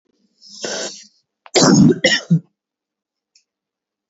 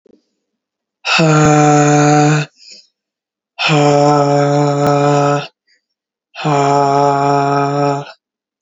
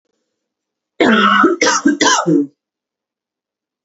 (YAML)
cough_length: 4.1 s
cough_amplitude: 29779
cough_signal_mean_std_ratio: 0.37
exhalation_length: 8.6 s
exhalation_amplitude: 29450
exhalation_signal_mean_std_ratio: 0.75
three_cough_length: 3.8 s
three_cough_amplitude: 32767
three_cough_signal_mean_std_ratio: 0.51
survey_phase: beta (2021-08-13 to 2022-03-07)
age: 18-44
gender: Female
wearing_mask: 'No'
symptom_cough_any: true
symptom_runny_or_blocked_nose: true
symptom_sore_throat: true
symptom_onset: 4 days
smoker_status: Never smoked
respiratory_condition_asthma: false
respiratory_condition_other: false
recruitment_source: REACT
submission_delay: 1 day
covid_test_result: Negative
covid_test_method: RT-qPCR
influenza_a_test_result: Negative
influenza_b_test_result: Negative